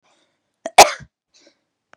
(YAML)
cough_length: 2.0 s
cough_amplitude: 32768
cough_signal_mean_std_ratio: 0.18
survey_phase: beta (2021-08-13 to 2022-03-07)
age: 18-44
gender: Female
wearing_mask: 'No'
symptom_fatigue: true
symptom_onset: 13 days
smoker_status: Never smoked
respiratory_condition_asthma: false
respiratory_condition_other: false
recruitment_source: REACT
submission_delay: 1 day
covid_test_result: Negative
covid_test_method: RT-qPCR
influenza_a_test_result: Negative
influenza_b_test_result: Negative